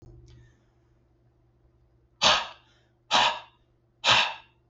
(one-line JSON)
{"exhalation_length": "4.7 s", "exhalation_amplitude": 19375, "exhalation_signal_mean_std_ratio": 0.33, "survey_phase": "beta (2021-08-13 to 2022-03-07)", "age": "45-64", "gender": "Male", "wearing_mask": "No", "symptom_none": true, "smoker_status": "Ex-smoker", "respiratory_condition_asthma": true, "respiratory_condition_other": false, "recruitment_source": "REACT", "submission_delay": "2 days", "covid_test_result": "Negative", "covid_test_method": "RT-qPCR", "influenza_a_test_result": "Negative", "influenza_b_test_result": "Negative"}